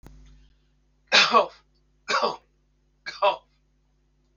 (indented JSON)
{
  "cough_length": "4.4 s",
  "cough_amplitude": 22431,
  "cough_signal_mean_std_ratio": 0.32,
  "survey_phase": "beta (2021-08-13 to 2022-03-07)",
  "age": "65+",
  "gender": "Male",
  "wearing_mask": "No",
  "symptom_runny_or_blocked_nose": true,
  "smoker_status": "Ex-smoker",
  "respiratory_condition_asthma": false,
  "respiratory_condition_other": false,
  "recruitment_source": "REACT",
  "submission_delay": "7 days",
  "covid_test_result": "Negative",
  "covid_test_method": "RT-qPCR"
}